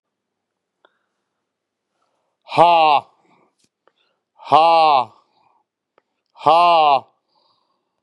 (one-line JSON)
{"exhalation_length": "8.0 s", "exhalation_amplitude": 32768, "exhalation_signal_mean_std_ratio": 0.36, "survey_phase": "beta (2021-08-13 to 2022-03-07)", "age": "45-64", "gender": "Male", "wearing_mask": "No", "symptom_cough_any": true, "symptom_runny_or_blocked_nose": true, "symptom_sore_throat": true, "symptom_fatigue": true, "symptom_fever_high_temperature": true, "symptom_onset": "6 days", "smoker_status": "Current smoker (1 to 10 cigarettes per day)", "respiratory_condition_asthma": false, "respiratory_condition_other": false, "recruitment_source": "Test and Trace", "submission_delay": "2 days", "covid_test_result": "Positive", "covid_test_method": "RT-qPCR", "covid_ct_value": 23.4, "covid_ct_gene": "ORF1ab gene", "covid_ct_mean": 24.1, "covid_viral_load": "12000 copies/ml", "covid_viral_load_category": "Low viral load (10K-1M copies/ml)"}